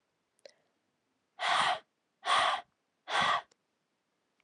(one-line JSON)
{"exhalation_length": "4.4 s", "exhalation_amplitude": 5371, "exhalation_signal_mean_std_ratio": 0.4, "survey_phase": "alpha (2021-03-01 to 2021-08-12)", "age": "18-44", "gender": "Female", "wearing_mask": "No", "symptom_cough_any": true, "symptom_fatigue": true, "symptom_headache": true, "symptom_change_to_sense_of_smell_or_taste": true, "smoker_status": "Never smoked", "respiratory_condition_asthma": false, "respiratory_condition_other": false, "recruitment_source": "Test and Trace", "submission_delay": "3 days", "covid_test_result": "Positive", "covid_test_method": "RT-qPCR", "covid_ct_value": 17.7, "covid_ct_gene": "ORF1ab gene", "covid_ct_mean": 18.2, "covid_viral_load": "1100000 copies/ml", "covid_viral_load_category": "High viral load (>1M copies/ml)"}